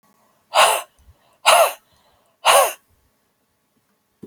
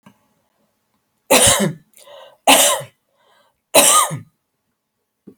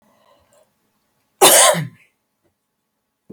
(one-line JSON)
{"exhalation_length": "4.3 s", "exhalation_amplitude": 32768, "exhalation_signal_mean_std_ratio": 0.34, "three_cough_length": "5.4 s", "three_cough_amplitude": 32768, "three_cough_signal_mean_std_ratio": 0.37, "cough_length": "3.3 s", "cough_amplitude": 32768, "cough_signal_mean_std_ratio": 0.28, "survey_phase": "alpha (2021-03-01 to 2021-08-12)", "age": "65+", "gender": "Female", "wearing_mask": "No", "symptom_none": true, "smoker_status": "Never smoked", "respiratory_condition_asthma": false, "respiratory_condition_other": false, "recruitment_source": "REACT", "submission_delay": "2 days", "covid_test_result": "Negative", "covid_test_method": "RT-qPCR"}